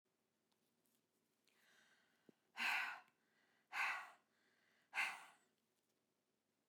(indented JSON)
{
  "exhalation_length": "6.7 s",
  "exhalation_amplitude": 1123,
  "exhalation_signal_mean_std_ratio": 0.32,
  "survey_phase": "beta (2021-08-13 to 2022-03-07)",
  "age": "65+",
  "gender": "Female",
  "wearing_mask": "No",
  "symptom_none": true,
  "smoker_status": "Never smoked",
  "respiratory_condition_asthma": false,
  "respiratory_condition_other": false,
  "recruitment_source": "REACT",
  "submission_delay": "1 day",
  "covid_test_result": "Negative",
  "covid_test_method": "RT-qPCR"
}